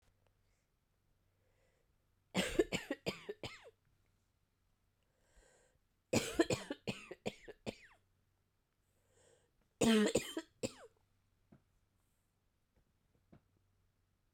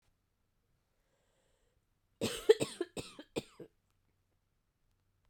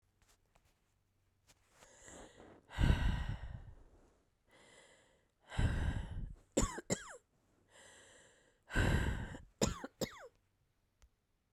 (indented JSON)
{
  "three_cough_length": "14.3 s",
  "three_cough_amplitude": 4070,
  "three_cough_signal_mean_std_ratio": 0.26,
  "cough_length": "5.3 s",
  "cough_amplitude": 9186,
  "cough_signal_mean_std_ratio": 0.18,
  "exhalation_length": "11.5 s",
  "exhalation_amplitude": 4898,
  "exhalation_signal_mean_std_ratio": 0.38,
  "survey_phase": "beta (2021-08-13 to 2022-03-07)",
  "age": "45-64",
  "gender": "Female",
  "wearing_mask": "No",
  "symptom_cough_any": true,
  "symptom_new_continuous_cough": true,
  "symptom_runny_or_blocked_nose": true,
  "symptom_shortness_of_breath": true,
  "symptom_sore_throat": true,
  "symptom_abdominal_pain": true,
  "symptom_diarrhoea": true,
  "symptom_fatigue": true,
  "symptom_fever_high_temperature": true,
  "symptom_headache": true,
  "symptom_change_to_sense_of_smell_or_taste": true,
  "symptom_loss_of_taste": true,
  "smoker_status": "Never smoked",
  "respiratory_condition_asthma": false,
  "respiratory_condition_other": false,
  "recruitment_source": "Test and Trace",
  "submission_delay": "3 days",
  "covid_test_result": "Positive",
  "covid_test_method": "LFT"
}